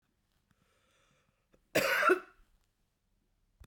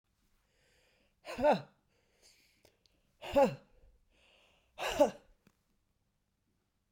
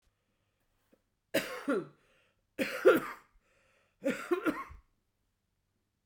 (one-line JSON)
{"cough_length": "3.7 s", "cough_amplitude": 6809, "cough_signal_mean_std_ratio": 0.28, "exhalation_length": "6.9 s", "exhalation_amplitude": 6721, "exhalation_signal_mean_std_ratio": 0.25, "three_cough_length": "6.1 s", "three_cough_amplitude": 9587, "three_cough_signal_mean_std_ratio": 0.31, "survey_phase": "beta (2021-08-13 to 2022-03-07)", "age": "65+", "gender": "Female", "wearing_mask": "No", "symptom_cough_any": true, "symptom_runny_or_blocked_nose": true, "symptom_shortness_of_breath": true, "symptom_sore_throat": true, "symptom_diarrhoea": true, "symptom_fatigue": true, "symptom_fever_high_temperature": true, "symptom_headache": true, "symptom_onset": "4 days", "smoker_status": "Ex-smoker", "respiratory_condition_asthma": false, "respiratory_condition_other": false, "recruitment_source": "Test and Trace", "submission_delay": "3 days", "covid_test_result": "Positive", "covid_test_method": "RT-qPCR", "covid_ct_value": 19.7, "covid_ct_gene": "ORF1ab gene", "covid_ct_mean": 20.3, "covid_viral_load": "210000 copies/ml", "covid_viral_load_category": "Low viral load (10K-1M copies/ml)"}